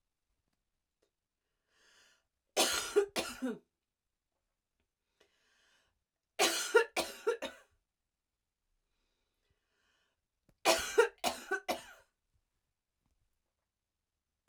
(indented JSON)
{
  "three_cough_length": "14.5 s",
  "three_cough_amplitude": 8240,
  "three_cough_signal_mean_std_ratio": 0.27,
  "survey_phase": "beta (2021-08-13 to 2022-03-07)",
  "age": "45-64",
  "gender": "Female",
  "wearing_mask": "No",
  "symptom_none": true,
  "symptom_onset": "5 days",
  "smoker_status": "Never smoked",
  "respiratory_condition_asthma": false,
  "respiratory_condition_other": false,
  "recruitment_source": "REACT",
  "submission_delay": "1 day",
  "covid_test_result": "Negative",
  "covid_test_method": "RT-qPCR",
  "influenza_a_test_result": "Negative",
  "influenza_b_test_result": "Negative"
}